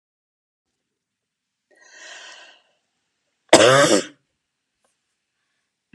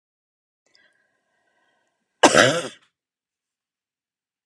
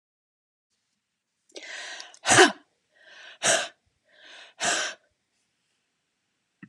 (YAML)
three_cough_length: 5.9 s
three_cough_amplitude: 32768
three_cough_signal_mean_std_ratio: 0.23
cough_length: 4.5 s
cough_amplitude: 32767
cough_signal_mean_std_ratio: 0.2
exhalation_length: 6.7 s
exhalation_amplitude: 25437
exhalation_signal_mean_std_ratio: 0.26
survey_phase: beta (2021-08-13 to 2022-03-07)
age: 65+
gender: Female
wearing_mask: 'No'
symptom_none: true
smoker_status: Never smoked
respiratory_condition_asthma: false
respiratory_condition_other: false
recruitment_source: REACT
submission_delay: 2 days
covid_test_result: Negative
covid_test_method: RT-qPCR